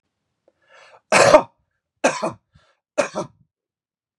{"three_cough_length": "4.2 s", "three_cough_amplitude": 32768, "three_cough_signal_mean_std_ratio": 0.28, "survey_phase": "beta (2021-08-13 to 2022-03-07)", "age": "45-64", "gender": "Male", "wearing_mask": "No", "symptom_none": true, "smoker_status": "Never smoked", "respiratory_condition_asthma": false, "respiratory_condition_other": false, "recruitment_source": "REACT", "submission_delay": "1 day", "covid_test_result": "Negative", "covid_test_method": "RT-qPCR", "influenza_a_test_result": "Negative", "influenza_b_test_result": "Negative"}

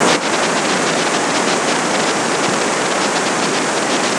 {"three_cough_length": "4.2 s", "three_cough_amplitude": 26028, "three_cough_signal_mean_std_ratio": 1.28, "survey_phase": "beta (2021-08-13 to 2022-03-07)", "age": "65+", "gender": "Female", "wearing_mask": "No", "symptom_cough_any": true, "symptom_runny_or_blocked_nose": true, "symptom_shortness_of_breath": true, "symptom_fatigue": true, "symptom_fever_high_temperature": true, "symptom_headache": true, "symptom_onset": "6 days", "smoker_status": "Never smoked", "respiratory_condition_asthma": false, "respiratory_condition_other": false, "recruitment_source": "Test and Trace", "submission_delay": "2 days", "covid_test_result": "Positive", "covid_test_method": "RT-qPCR", "covid_ct_value": 18.0, "covid_ct_gene": "ORF1ab gene"}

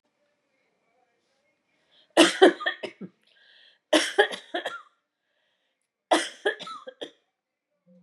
{"three_cough_length": "8.0 s", "three_cough_amplitude": 27150, "three_cough_signal_mean_std_ratio": 0.27, "survey_phase": "beta (2021-08-13 to 2022-03-07)", "age": "45-64", "gender": "Female", "wearing_mask": "No", "symptom_none": true, "smoker_status": "Ex-smoker", "respiratory_condition_asthma": false, "respiratory_condition_other": false, "recruitment_source": "REACT", "submission_delay": "1 day", "covid_test_result": "Negative", "covid_test_method": "RT-qPCR", "influenza_a_test_result": "Negative", "influenza_b_test_result": "Negative"}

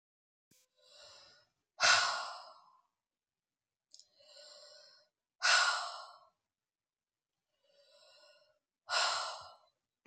{"exhalation_length": "10.1 s", "exhalation_amplitude": 6717, "exhalation_signal_mean_std_ratio": 0.3, "survey_phase": "beta (2021-08-13 to 2022-03-07)", "age": "45-64", "gender": "Female", "wearing_mask": "No", "symptom_none": true, "smoker_status": "Ex-smoker", "respiratory_condition_asthma": false, "respiratory_condition_other": false, "recruitment_source": "REACT", "submission_delay": "1 day", "covid_test_result": "Negative", "covid_test_method": "RT-qPCR", "influenza_a_test_result": "Negative", "influenza_b_test_result": "Negative"}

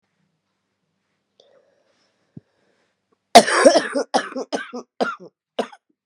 {"three_cough_length": "6.1 s", "three_cough_amplitude": 32768, "three_cough_signal_mean_std_ratio": 0.26, "survey_phase": "beta (2021-08-13 to 2022-03-07)", "age": "45-64", "gender": "Female", "wearing_mask": "No", "symptom_cough_any": true, "symptom_sore_throat": true, "symptom_diarrhoea": true, "symptom_fatigue": true, "symptom_headache": true, "symptom_change_to_sense_of_smell_or_taste": true, "symptom_onset": "3 days", "smoker_status": "Ex-smoker", "respiratory_condition_asthma": false, "respiratory_condition_other": false, "recruitment_source": "Test and Trace", "submission_delay": "1 day", "covid_test_result": "Positive", "covid_test_method": "RT-qPCR", "covid_ct_value": 12.9, "covid_ct_gene": "ORF1ab gene", "covid_ct_mean": 13.6, "covid_viral_load": "35000000 copies/ml", "covid_viral_load_category": "High viral load (>1M copies/ml)"}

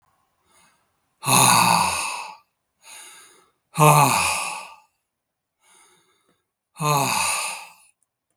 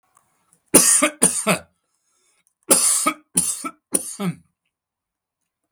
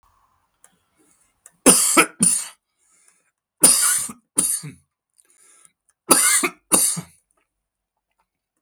{"exhalation_length": "8.4 s", "exhalation_amplitude": 32064, "exhalation_signal_mean_std_ratio": 0.42, "cough_length": "5.7 s", "cough_amplitude": 32768, "cough_signal_mean_std_ratio": 0.39, "three_cough_length": "8.6 s", "three_cough_amplitude": 32768, "three_cough_signal_mean_std_ratio": 0.36, "survey_phase": "beta (2021-08-13 to 2022-03-07)", "age": "65+", "gender": "Male", "wearing_mask": "No", "symptom_shortness_of_breath": true, "symptom_onset": "6 days", "smoker_status": "Ex-smoker", "respiratory_condition_asthma": false, "respiratory_condition_other": false, "recruitment_source": "REACT", "submission_delay": "3 days", "covid_test_result": "Negative", "covid_test_method": "RT-qPCR", "influenza_a_test_result": "Negative", "influenza_b_test_result": "Negative"}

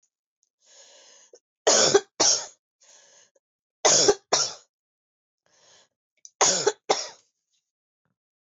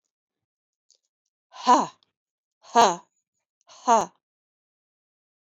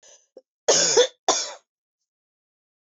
{"three_cough_length": "8.4 s", "three_cough_amplitude": 18401, "three_cough_signal_mean_std_ratio": 0.32, "exhalation_length": "5.5 s", "exhalation_amplitude": 18037, "exhalation_signal_mean_std_ratio": 0.24, "cough_length": "2.9 s", "cough_amplitude": 17521, "cough_signal_mean_std_ratio": 0.35, "survey_phase": "beta (2021-08-13 to 2022-03-07)", "age": "45-64", "gender": "Female", "wearing_mask": "No", "symptom_cough_any": true, "symptom_runny_or_blocked_nose": true, "symptom_fatigue": true, "symptom_fever_high_temperature": true, "symptom_headache": true, "symptom_change_to_sense_of_smell_or_taste": true, "symptom_onset": "3 days", "smoker_status": "Never smoked", "respiratory_condition_asthma": false, "respiratory_condition_other": false, "recruitment_source": "Test and Trace", "submission_delay": "2 days", "covid_test_result": "Positive", "covid_test_method": "RT-qPCR"}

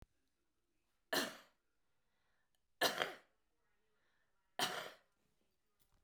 {"three_cough_length": "6.0 s", "three_cough_amplitude": 5066, "three_cough_signal_mean_std_ratio": 0.27, "survey_phase": "beta (2021-08-13 to 2022-03-07)", "age": "65+", "gender": "Female", "wearing_mask": "No", "symptom_cough_any": true, "symptom_onset": "12 days", "smoker_status": "Current smoker (1 to 10 cigarettes per day)", "respiratory_condition_asthma": false, "respiratory_condition_other": false, "recruitment_source": "REACT", "submission_delay": "3 days", "covid_test_result": "Negative", "covid_test_method": "RT-qPCR"}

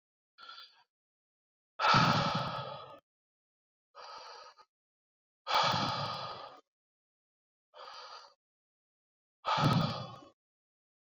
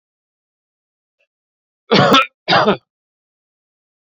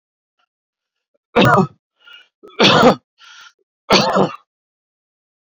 {"exhalation_length": "11.0 s", "exhalation_amplitude": 7448, "exhalation_signal_mean_std_ratio": 0.38, "cough_length": "4.1 s", "cough_amplitude": 32199, "cough_signal_mean_std_ratio": 0.31, "three_cough_length": "5.5 s", "three_cough_amplitude": 30468, "three_cough_signal_mean_std_ratio": 0.36, "survey_phase": "beta (2021-08-13 to 2022-03-07)", "age": "45-64", "gender": "Male", "wearing_mask": "No", "symptom_cough_any": true, "symptom_new_continuous_cough": true, "symptom_runny_or_blocked_nose": true, "symptom_shortness_of_breath": true, "symptom_sore_throat": true, "symptom_diarrhoea": true, "symptom_fatigue": true, "symptom_headache": true, "symptom_change_to_sense_of_smell_or_taste": true, "symptom_onset": "2 days", "smoker_status": "Never smoked", "respiratory_condition_asthma": true, "respiratory_condition_other": false, "recruitment_source": "Test and Trace", "submission_delay": "1 day", "covid_test_result": "Positive", "covid_test_method": "RT-qPCR"}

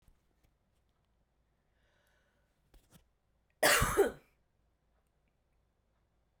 {"cough_length": "6.4 s", "cough_amplitude": 9855, "cough_signal_mean_std_ratio": 0.22, "survey_phase": "beta (2021-08-13 to 2022-03-07)", "age": "18-44", "gender": "Female", "wearing_mask": "No", "symptom_cough_any": true, "smoker_status": "Never smoked", "respiratory_condition_asthma": false, "respiratory_condition_other": false, "recruitment_source": "REACT", "submission_delay": "2 days", "covid_test_result": "Negative", "covid_test_method": "RT-qPCR"}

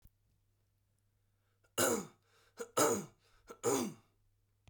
{"three_cough_length": "4.7 s", "three_cough_amplitude": 4837, "three_cough_signal_mean_std_ratio": 0.35, "survey_phase": "beta (2021-08-13 to 2022-03-07)", "age": "18-44", "gender": "Male", "wearing_mask": "No", "symptom_none": true, "smoker_status": "Never smoked", "respiratory_condition_asthma": false, "respiratory_condition_other": false, "recruitment_source": "REACT", "submission_delay": "1 day", "covid_test_result": "Negative", "covid_test_method": "RT-qPCR"}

